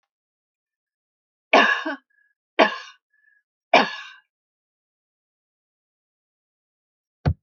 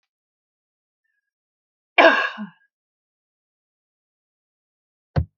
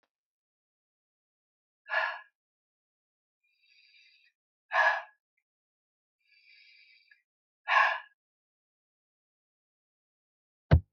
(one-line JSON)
{"three_cough_length": "7.4 s", "three_cough_amplitude": 26435, "three_cough_signal_mean_std_ratio": 0.23, "cough_length": "5.4 s", "cough_amplitude": 29952, "cough_signal_mean_std_ratio": 0.2, "exhalation_length": "10.9 s", "exhalation_amplitude": 12262, "exhalation_signal_mean_std_ratio": 0.21, "survey_phase": "alpha (2021-03-01 to 2021-08-12)", "age": "65+", "gender": "Female", "wearing_mask": "No", "symptom_none": true, "smoker_status": "Never smoked", "respiratory_condition_asthma": false, "respiratory_condition_other": false, "recruitment_source": "REACT", "submission_delay": "2 days", "covid_test_result": "Negative", "covid_test_method": "RT-qPCR"}